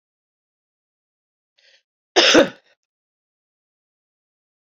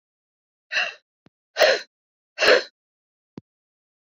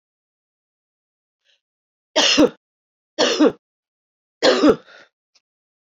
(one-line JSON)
{"cough_length": "4.8 s", "cough_amplitude": 28296, "cough_signal_mean_std_ratio": 0.2, "exhalation_length": "4.1 s", "exhalation_amplitude": 24388, "exhalation_signal_mean_std_ratio": 0.29, "three_cough_length": "5.8 s", "three_cough_amplitude": 27243, "three_cough_signal_mean_std_ratio": 0.32, "survey_phase": "beta (2021-08-13 to 2022-03-07)", "age": "45-64", "gender": "Female", "wearing_mask": "No", "symptom_runny_or_blocked_nose": true, "symptom_headache": true, "symptom_change_to_sense_of_smell_or_taste": true, "smoker_status": "Never smoked", "respiratory_condition_asthma": false, "respiratory_condition_other": false, "recruitment_source": "Test and Trace", "submission_delay": "2 days", "covid_test_result": "Positive", "covid_test_method": "RT-qPCR", "covid_ct_value": 18.5, "covid_ct_gene": "N gene"}